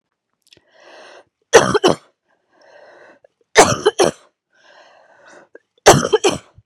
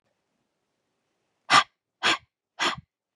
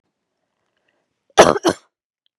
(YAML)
three_cough_length: 6.7 s
three_cough_amplitude: 32768
three_cough_signal_mean_std_ratio: 0.3
exhalation_length: 3.2 s
exhalation_amplitude: 22690
exhalation_signal_mean_std_ratio: 0.26
cough_length: 2.4 s
cough_amplitude: 32768
cough_signal_mean_std_ratio: 0.22
survey_phase: beta (2021-08-13 to 2022-03-07)
age: 18-44
gender: Female
wearing_mask: 'No'
symptom_cough_any: true
symptom_shortness_of_breath: true
symptom_fatigue: true
symptom_onset: 7 days
smoker_status: Never smoked
respiratory_condition_asthma: false
respiratory_condition_other: false
recruitment_source: Test and Trace
submission_delay: 2 days
covid_test_result: Positive
covid_test_method: ePCR